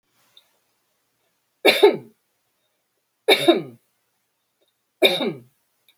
{"three_cough_length": "6.0 s", "three_cough_amplitude": 28853, "three_cough_signal_mean_std_ratio": 0.28, "survey_phase": "beta (2021-08-13 to 2022-03-07)", "age": "65+", "gender": "Female", "wearing_mask": "No", "symptom_none": true, "symptom_onset": "12 days", "smoker_status": "Ex-smoker", "respiratory_condition_asthma": false, "respiratory_condition_other": false, "recruitment_source": "REACT", "submission_delay": "2 days", "covid_test_result": "Negative", "covid_test_method": "RT-qPCR"}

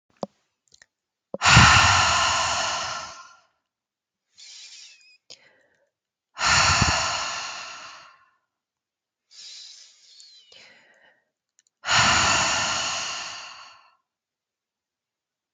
{"exhalation_length": "15.5 s", "exhalation_amplitude": 31074, "exhalation_signal_mean_std_ratio": 0.4, "survey_phase": "beta (2021-08-13 to 2022-03-07)", "age": "18-44", "gender": "Female", "wearing_mask": "No", "symptom_cough_any": true, "symptom_runny_or_blocked_nose": true, "symptom_sore_throat": true, "symptom_fatigue": true, "symptom_fever_high_temperature": true, "symptom_onset": "3 days", "smoker_status": "Never smoked", "respiratory_condition_asthma": false, "respiratory_condition_other": false, "recruitment_source": "Test and Trace", "submission_delay": "1 day", "covid_test_result": "Positive", "covid_test_method": "RT-qPCR", "covid_ct_value": 15.0, "covid_ct_gene": "ORF1ab gene"}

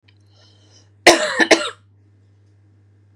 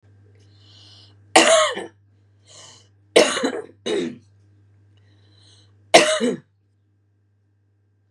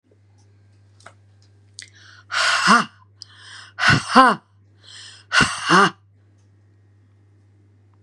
{"cough_length": "3.2 s", "cough_amplitude": 32768, "cough_signal_mean_std_ratio": 0.29, "three_cough_length": "8.1 s", "three_cough_amplitude": 32768, "three_cough_signal_mean_std_ratio": 0.32, "exhalation_length": "8.0 s", "exhalation_amplitude": 32767, "exhalation_signal_mean_std_ratio": 0.35, "survey_phase": "beta (2021-08-13 to 2022-03-07)", "age": "45-64", "gender": "Female", "wearing_mask": "No", "symptom_cough_any": true, "symptom_runny_or_blocked_nose": true, "symptom_sore_throat": true, "symptom_fatigue": true, "symptom_fever_high_temperature": true, "symptom_headache": true, "smoker_status": "Ex-smoker", "respiratory_condition_asthma": false, "respiratory_condition_other": false, "recruitment_source": "Test and Trace", "submission_delay": "1 day", "covid_test_result": "Positive", "covid_test_method": "RT-qPCR", "covid_ct_value": 19.9, "covid_ct_gene": "N gene"}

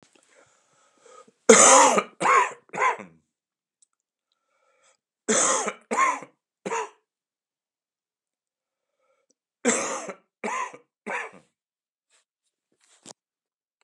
{"three_cough_length": "13.8 s", "three_cough_amplitude": 32767, "three_cough_signal_mean_std_ratio": 0.3, "survey_phase": "beta (2021-08-13 to 2022-03-07)", "age": "65+", "gender": "Male", "wearing_mask": "Yes", "symptom_cough_any": true, "symptom_runny_or_blocked_nose": true, "symptom_fatigue": true, "symptom_onset": "4 days", "smoker_status": "Never smoked", "respiratory_condition_asthma": false, "respiratory_condition_other": false, "recruitment_source": "Test and Trace", "submission_delay": "2 days", "covid_test_result": "Positive", "covid_test_method": "ePCR"}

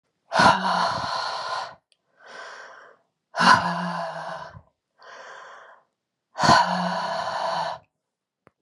{"exhalation_length": "8.6 s", "exhalation_amplitude": 24491, "exhalation_signal_mean_std_ratio": 0.48, "survey_phase": "beta (2021-08-13 to 2022-03-07)", "age": "45-64", "gender": "Female", "wearing_mask": "No", "symptom_none": true, "smoker_status": "Never smoked", "respiratory_condition_asthma": false, "respiratory_condition_other": false, "recruitment_source": "REACT", "submission_delay": "2 days", "covid_test_result": "Negative", "covid_test_method": "RT-qPCR"}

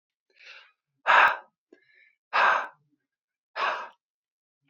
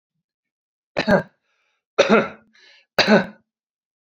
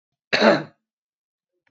{"exhalation_length": "4.7 s", "exhalation_amplitude": 16542, "exhalation_signal_mean_std_ratio": 0.33, "three_cough_length": "4.1 s", "three_cough_amplitude": 27262, "three_cough_signal_mean_std_ratio": 0.32, "cough_length": "1.7 s", "cough_amplitude": 27375, "cough_signal_mean_std_ratio": 0.31, "survey_phase": "beta (2021-08-13 to 2022-03-07)", "age": "45-64", "gender": "Male", "wearing_mask": "No", "symptom_none": true, "smoker_status": "Never smoked", "respiratory_condition_asthma": false, "respiratory_condition_other": false, "recruitment_source": "REACT", "submission_delay": "4 days", "covid_test_result": "Negative", "covid_test_method": "RT-qPCR"}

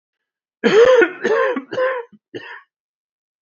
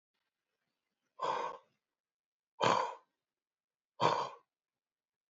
{"cough_length": "3.4 s", "cough_amplitude": 28000, "cough_signal_mean_std_ratio": 0.48, "exhalation_length": "5.3 s", "exhalation_amplitude": 6820, "exhalation_signal_mean_std_ratio": 0.31, "survey_phase": "alpha (2021-03-01 to 2021-08-12)", "age": "65+", "gender": "Male", "wearing_mask": "No", "symptom_cough_any": true, "symptom_fatigue": true, "symptom_headache": true, "symptom_change_to_sense_of_smell_or_taste": true, "symptom_loss_of_taste": true, "smoker_status": "Ex-smoker", "respiratory_condition_asthma": false, "respiratory_condition_other": false, "recruitment_source": "Test and Trace", "submission_delay": "2 days", "covid_test_result": "Positive", "covid_test_method": "RT-qPCR", "covid_ct_value": 11.2, "covid_ct_gene": "S gene", "covid_ct_mean": 11.5, "covid_viral_load": "160000000 copies/ml", "covid_viral_load_category": "High viral load (>1M copies/ml)"}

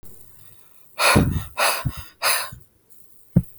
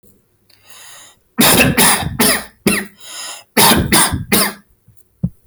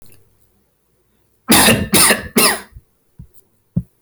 {"exhalation_length": "3.6 s", "exhalation_amplitude": 24957, "exhalation_signal_mean_std_ratio": 0.46, "three_cough_length": "5.5 s", "three_cough_amplitude": 32768, "three_cough_signal_mean_std_ratio": 0.53, "cough_length": "4.0 s", "cough_amplitude": 32768, "cough_signal_mean_std_ratio": 0.4, "survey_phase": "alpha (2021-03-01 to 2021-08-12)", "age": "18-44", "gender": "Male", "wearing_mask": "No", "symptom_none": true, "smoker_status": "Never smoked", "respiratory_condition_asthma": false, "respiratory_condition_other": false, "recruitment_source": "REACT", "submission_delay": "2 days", "covid_test_result": "Negative", "covid_test_method": "RT-qPCR"}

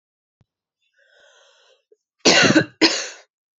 {"cough_length": "3.6 s", "cough_amplitude": 30739, "cough_signal_mean_std_ratio": 0.32, "survey_phase": "beta (2021-08-13 to 2022-03-07)", "age": "18-44", "gender": "Female", "wearing_mask": "No", "symptom_cough_any": true, "symptom_runny_or_blocked_nose": true, "smoker_status": "Never smoked", "respiratory_condition_asthma": true, "respiratory_condition_other": false, "recruitment_source": "REACT", "submission_delay": "1 day", "covid_test_result": "Negative", "covid_test_method": "RT-qPCR"}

